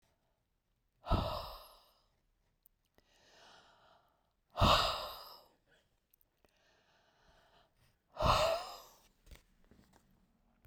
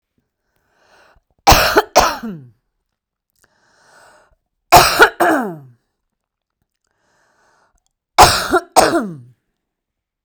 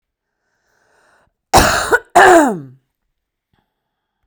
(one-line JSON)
{"exhalation_length": "10.7 s", "exhalation_amplitude": 5264, "exhalation_signal_mean_std_ratio": 0.29, "three_cough_length": "10.2 s", "three_cough_amplitude": 32768, "three_cough_signal_mean_std_ratio": 0.32, "cough_length": "4.3 s", "cough_amplitude": 32768, "cough_signal_mean_std_ratio": 0.34, "survey_phase": "beta (2021-08-13 to 2022-03-07)", "age": "45-64", "gender": "Female", "wearing_mask": "No", "symptom_cough_any": true, "symptom_headache": true, "symptom_onset": "3 days", "smoker_status": "Ex-smoker", "respiratory_condition_asthma": false, "respiratory_condition_other": false, "recruitment_source": "Test and Trace", "submission_delay": "2 days", "covid_test_result": "Positive", "covid_test_method": "RT-qPCR", "covid_ct_value": 22.9, "covid_ct_gene": "ORF1ab gene", "covid_ct_mean": 23.4, "covid_viral_load": "21000 copies/ml", "covid_viral_load_category": "Low viral load (10K-1M copies/ml)"}